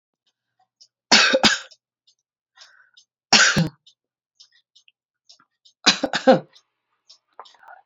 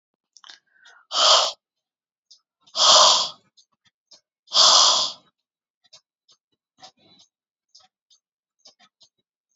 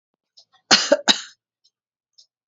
{"three_cough_length": "7.9 s", "three_cough_amplitude": 31765, "three_cough_signal_mean_std_ratio": 0.29, "exhalation_length": "9.6 s", "exhalation_amplitude": 27261, "exhalation_signal_mean_std_ratio": 0.31, "cough_length": "2.5 s", "cough_amplitude": 32767, "cough_signal_mean_std_ratio": 0.26, "survey_phase": "alpha (2021-03-01 to 2021-08-12)", "age": "45-64", "gender": "Female", "wearing_mask": "No", "symptom_cough_any": true, "symptom_fatigue": true, "symptom_change_to_sense_of_smell_or_taste": true, "symptom_loss_of_taste": true, "smoker_status": "Never smoked", "respiratory_condition_asthma": false, "respiratory_condition_other": false, "recruitment_source": "Test and Trace", "submission_delay": "1 day", "covid_test_result": "Positive", "covid_test_method": "RT-qPCR", "covid_ct_value": 23.0, "covid_ct_gene": "N gene"}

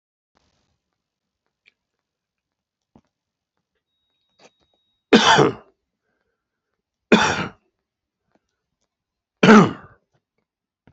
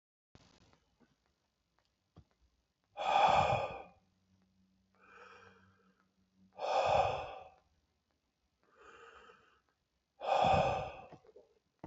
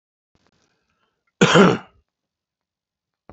{"three_cough_length": "10.9 s", "three_cough_amplitude": 28237, "three_cough_signal_mean_std_ratio": 0.22, "exhalation_length": "11.9 s", "exhalation_amplitude": 4860, "exhalation_signal_mean_std_ratio": 0.35, "cough_length": "3.3 s", "cough_amplitude": 28878, "cough_signal_mean_std_ratio": 0.25, "survey_phase": "beta (2021-08-13 to 2022-03-07)", "age": "65+", "gender": "Male", "wearing_mask": "No", "symptom_none": true, "smoker_status": "Current smoker (1 to 10 cigarettes per day)", "respiratory_condition_asthma": false, "respiratory_condition_other": false, "recruitment_source": "Test and Trace", "submission_delay": "1 day", "covid_test_result": "Positive", "covid_test_method": "RT-qPCR", "covid_ct_value": 21.7, "covid_ct_gene": "ORF1ab gene", "covid_ct_mean": 22.1, "covid_viral_load": "56000 copies/ml", "covid_viral_load_category": "Low viral load (10K-1M copies/ml)"}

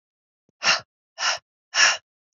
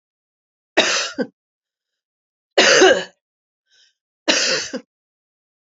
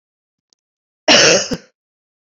{"exhalation_length": "2.4 s", "exhalation_amplitude": 21342, "exhalation_signal_mean_std_ratio": 0.36, "three_cough_length": "5.6 s", "three_cough_amplitude": 32767, "three_cough_signal_mean_std_ratio": 0.35, "cough_length": "2.2 s", "cough_amplitude": 31451, "cough_signal_mean_std_ratio": 0.35, "survey_phase": "beta (2021-08-13 to 2022-03-07)", "age": "18-44", "gender": "Female", "wearing_mask": "No", "symptom_none": true, "symptom_onset": "4 days", "smoker_status": "Never smoked", "respiratory_condition_asthma": true, "respiratory_condition_other": false, "recruitment_source": "Test and Trace", "submission_delay": "2 days", "covid_test_result": "Positive", "covid_test_method": "RT-qPCR", "covid_ct_value": 22.9, "covid_ct_gene": "ORF1ab gene", "covid_ct_mean": 23.1, "covid_viral_load": "27000 copies/ml", "covid_viral_load_category": "Low viral load (10K-1M copies/ml)"}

